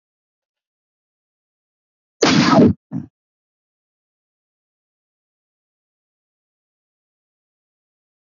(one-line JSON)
{"cough_length": "8.3 s", "cough_amplitude": 27805, "cough_signal_mean_std_ratio": 0.21, "survey_phase": "alpha (2021-03-01 to 2021-08-12)", "age": "45-64", "gender": "Male", "wearing_mask": "No", "symptom_cough_any": true, "symptom_fatigue": true, "symptom_headache": true, "symptom_onset": "6 days", "smoker_status": "Ex-smoker", "respiratory_condition_asthma": true, "respiratory_condition_other": true, "recruitment_source": "Test and Trace", "submission_delay": "3 days", "covid_test_result": "Positive", "covid_test_method": "RT-qPCR"}